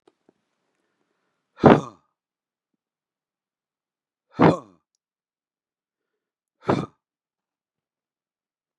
{
  "exhalation_length": "8.8 s",
  "exhalation_amplitude": 32768,
  "exhalation_signal_mean_std_ratio": 0.17,
  "survey_phase": "beta (2021-08-13 to 2022-03-07)",
  "age": "45-64",
  "gender": "Male",
  "wearing_mask": "No",
  "symptom_none": true,
  "smoker_status": "Never smoked",
  "respiratory_condition_asthma": false,
  "respiratory_condition_other": false,
  "recruitment_source": "REACT",
  "submission_delay": "1 day",
  "covid_test_result": "Negative",
  "covid_test_method": "RT-qPCR",
  "influenza_a_test_result": "Negative",
  "influenza_b_test_result": "Negative"
}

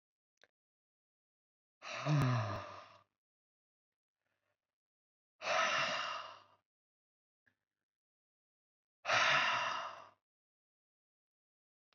{
  "exhalation_length": "11.9 s",
  "exhalation_amplitude": 3485,
  "exhalation_signal_mean_std_ratio": 0.36,
  "survey_phase": "beta (2021-08-13 to 2022-03-07)",
  "age": "18-44",
  "gender": "Male",
  "wearing_mask": "No",
  "symptom_cough_any": true,
  "symptom_new_continuous_cough": true,
  "symptom_runny_or_blocked_nose": true,
  "symptom_sore_throat": true,
  "symptom_fatigue": true,
  "symptom_change_to_sense_of_smell_or_taste": true,
  "symptom_onset": "4 days",
  "smoker_status": "Current smoker (e-cigarettes or vapes only)",
  "respiratory_condition_asthma": false,
  "respiratory_condition_other": false,
  "recruitment_source": "Test and Trace",
  "submission_delay": "1 day",
  "covid_test_result": "Positive",
  "covid_test_method": "ePCR"
}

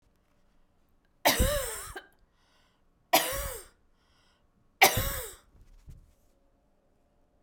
{
  "three_cough_length": "7.4 s",
  "three_cough_amplitude": 17698,
  "three_cough_signal_mean_std_ratio": 0.3,
  "survey_phase": "beta (2021-08-13 to 2022-03-07)",
  "age": "45-64",
  "gender": "Female",
  "wearing_mask": "No",
  "symptom_none": true,
  "symptom_onset": "8 days",
  "smoker_status": "Never smoked",
  "respiratory_condition_asthma": false,
  "respiratory_condition_other": false,
  "recruitment_source": "REACT",
  "submission_delay": "2 days",
  "covid_test_result": "Negative",
  "covid_test_method": "RT-qPCR"
}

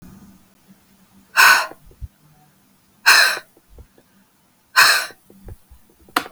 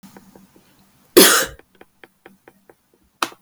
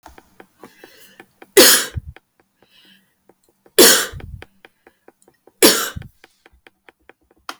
{
  "exhalation_length": "6.3 s",
  "exhalation_amplitude": 32768,
  "exhalation_signal_mean_std_ratio": 0.32,
  "cough_length": "3.4 s",
  "cough_amplitude": 32768,
  "cough_signal_mean_std_ratio": 0.25,
  "three_cough_length": "7.6 s",
  "three_cough_amplitude": 32768,
  "three_cough_signal_mean_std_ratio": 0.27,
  "survey_phase": "beta (2021-08-13 to 2022-03-07)",
  "age": "18-44",
  "gender": "Female",
  "wearing_mask": "No",
  "symptom_cough_any": true,
  "smoker_status": "Never smoked",
  "respiratory_condition_asthma": true,
  "respiratory_condition_other": false,
  "recruitment_source": "REACT",
  "submission_delay": "1 day",
  "covid_test_result": "Negative",
  "covid_test_method": "RT-qPCR",
  "influenza_a_test_result": "Negative",
  "influenza_b_test_result": "Negative"
}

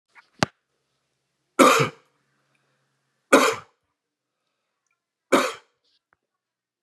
{
  "three_cough_length": "6.8 s",
  "three_cough_amplitude": 30197,
  "three_cough_signal_mean_std_ratio": 0.24,
  "survey_phase": "beta (2021-08-13 to 2022-03-07)",
  "age": "45-64",
  "gender": "Male",
  "wearing_mask": "No",
  "symptom_none": true,
  "smoker_status": "Current smoker (11 or more cigarettes per day)",
  "respiratory_condition_asthma": false,
  "respiratory_condition_other": false,
  "recruitment_source": "REACT",
  "submission_delay": "1 day",
  "covid_test_result": "Negative",
  "covid_test_method": "RT-qPCR",
  "influenza_a_test_result": "Negative",
  "influenza_b_test_result": "Negative"
}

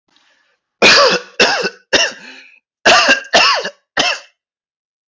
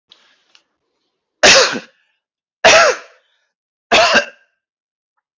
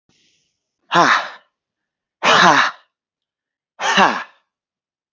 {
  "cough_length": "5.1 s",
  "cough_amplitude": 32768,
  "cough_signal_mean_std_ratio": 0.49,
  "three_cough_length": "5.4 s",
  "three_cough_amplitude": 32768,
  "three_cough_signal_mean_std_ratio": 0.35,
  "exhalation_length": "5.1 s",
  "exhalation_amplitude": 30368,
  "exhalation_signal_mean_std_ratio": 0.38,
  "survey_phase": "alpha (2021-03-01 to 2021-08-12)",
  "age": "18-44",
  "gender": "Male",
  "wearing_mask": "No",
  "symptom_cough_any": true,
  "smoker_status": "Ex-smoker",
  "respiratory_condition_asthma": false,
  "respiratory_condition_other": false,
  "recruitment_source": "REACT",
  "submission_delay": "1 day",
  "covid_test_result": "Negative",
  "covid_test_method": "RT-qPCR"
}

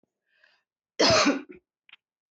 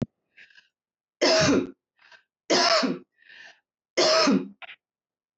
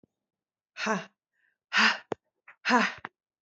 {
  "cough_length": "2.3 s",
  "cough_amplitude": 13210,
  "cough_signal_mean_std_ratio": 0.35,
  "three_cough_length": "5.4 s",
  "three_cough_amplitude": 13089,
  "three_cough_signal_mean_std_ratio": 0.45,
  "exhalation_length": "3.4 s",
  "exhalation_amplitude": 13370,
  "exhalation_signal_mean_std_ratio": 0.35,
  "survey_phase": "alpha (2021-03-01 to 2021-08-12)",
  "age": "45-64",
  "gender": "Female",
  "wearing_mask": "No",
  "symptom_none": true,
  "smoker_status": "Never smoked",
  "respiratory_condition_asthma": false,
  "respiratory_condition_other": false,
  "recruitment_source": "REACT",
  "submission_delay": "3 days",
  "covid_test_result": "Negative",
  "covid_test_method": "RT-qPCR"
}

